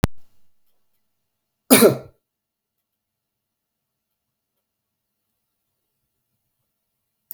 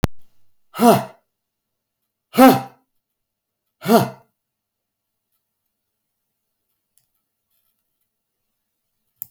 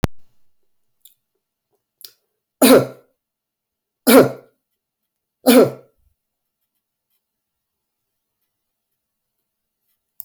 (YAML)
cough_length: 7.3 s
cough_amplitude: 32768
cough_signal_mean_std_ratio: 0.17
exhalation_length: 9.3 s
exhalation_amplitude: 32768
exhalation_signal_mean_std_ratio: 0.22
three_cough_length: 10.2 s
three_cough_amplitude: 32768
three_cough_signal_mean_std_ratio: 0.22
survey_phase: beta (2021-08-13 to 2022-03-07)
age: 65+
gender: Male
wearing_mask: 'No'
symptom_fatigue: true
smoker_status: Never smoked
respiratory_condition_asthma: false
respiratory_condition_other: false
recruitment_source: REACT
submission_delay: 1 day
covid_test_result: Negative
covid_test_method: RT-qPCR
influenza_a_test_result: Negative
influenza_b_test_result: Negative